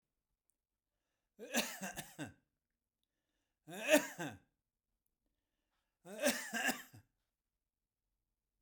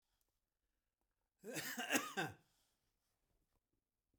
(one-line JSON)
{"three_cough_length": "8.6 s", "three_cough_amplitude": 5260, "three_cough_signal_mean_std_ratio": 0.28, "cough_length": "4.2 s", "cough_amplitude": 2501, "cough_signal_mean_std_ratio": 0.32, "survey_phase": "beta (2021-08-13 to 2022-03-07)", "age": "65+", "gender": "Male", "wearing_mask": "No", "symptom_none": true, "smoker_status": "Ex-smoker", "respiratory_condition_asthma": false, "respiratory_condition_other": false, "recruitment_source": "REACT", "submission_delay": "0 days", "covid_test_result": "Negative", "covid_test_method": "RT-qPCR"}